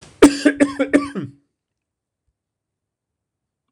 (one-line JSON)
{"cough_length": "3.7 s", "cough_amplitude": 26028, "cough_signal_mean_std_ratio": 0.29, "survey_phase": "beta (2021-08-13 to 2022-03-07)", "age": "65+", "gender": "Male", "wearing_mask": "No", "symptom_none": true, "smoker_status": "Never smoked", "respiratory_condition_asthma": true, "respiratory_condition_other": false, "recruitment_source": "REACT", "submission_delay": "2 days", "covid_test_result": "Negative", "covid_test_method": "RT-qPCR"}